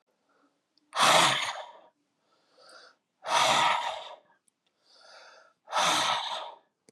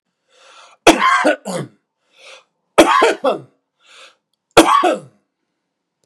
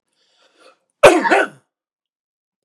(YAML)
exhalation_length: 6.9 s
exhalation_amplitude: 12244
exhalation_signal_mean_std_ratio: 0.44
three_cough_length: 6.1 s
three_cough_amplitude: 32768
three_cough_signal_mean_std_ratio: 0.39
cough_length: 2.6 s
cough_amplitude: 32768
cough_signal_mean_std_ratio: 0.29
survey_phase: beta (2021-08-13 to 2022-03-07)
age: 45-64
gender: Male
wearing_mask: 'No'
symptom_none: true
smoker_status: Ex-smoker
respiratory_condition_asthma: false
respiratory_condition_other: false
recruitment_source: REACT
submission_delay: 1 day
covid_test_result: Negative
covid_test_method: RT-qPCR
influenza_a_test_result: Negative
influenza_b_test_result: Negative